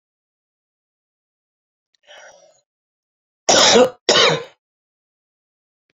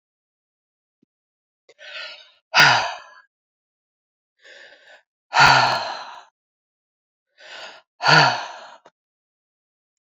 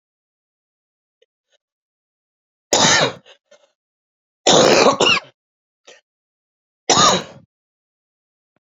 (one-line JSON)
{"cough_length": "6.0 s", "cough_amplitude": 31984, "cough_signal_mean_std_ratio": 0.28, "exhalation_length": "10.1 s", "exhalation_amplitude": 32767, "exhalation_signal_mean_std_ratio": 0.29, "three_cough_length": "8.6 s", "three_cough_amplitude": 32768, "three_cough_signal_mean_std_ratio": 0.33, "survey_phase": "beta (2021-08-13 to 2022-03-07)", "age": "45-64", "gender": "Female", "wearing_mask": "No", "symptom_cough_any": true, "symptom_new_continuous_cough": true, "symptom_runny_or_blocked_nose": true, "symptom_shortness_of_breath": true, "symptom_sore_throat": true, "symptom_fatigue": true, "symptom_headache": true, "symptom_other": true, "symptom_onset": "3 days", "smoker_status": "Current smoker (1 to 10 cigarettes per day)", "respiratory_condition_asthma": false, "respiratory_condition_other": false, "recruitment_source": "Test and Trace", "submission_delay": "1 day", "covid_test_result": "Positive", "covid_test_method": "RT-qPCR", "covid_ct_value": 21.8, "covid_ct_gene": "N gene"}